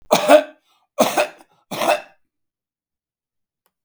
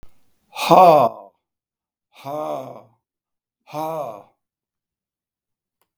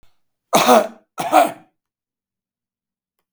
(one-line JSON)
{"three_cough_length": "3.8 s", "three_cough_amplitude": 32768, "three_cough_signal_mean_std_ratio": 0.33, "exhalation_length": "6.0 s", "exhalation_amplitude": 32768, "exhalation_signal_mean_std_ratio": 0.29, "cough_length": "3.3 s", "cough_amplitude": 32768, "cough_signal_mean_std_ratio": 0.33, "survey_phase": "beta (2021-08-13 to 2022-03-07)", "age": "65+", "gender": "Male", "wearing_mask": "No", "symptom_none": true, "smoker_status": "Ex-smoker", "respiratory_condition_asthma": false, "respiratory_condition_other": false, "recruitment_source": "REACT", "submission_delay": "1 day", "covid_test_result": "Negative", "covid_test_method": "RT-qPCR"}